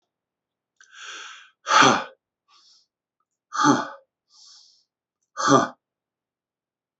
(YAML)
exhalation_length: 7.0 s
exhalation_amplitude: 25630
exhalation_signal_mean_std_ratio: 0.29
survey_phase: beta (2021-08-13 to 2022-03-07)
age: 45-64
gender: Male
wearing_mask: 'No'
symptom_none: true
smoker_status: Never smoked
respiratory_condition_asthma: false
respiratory_condition_other: false
recruitment_source: REACT
submission_delay: 5 days
covid_test_result: Negative
covid_test_method: RT-qPCR
influenza_a_test_result: Negative
influenza_b_test_result: Negative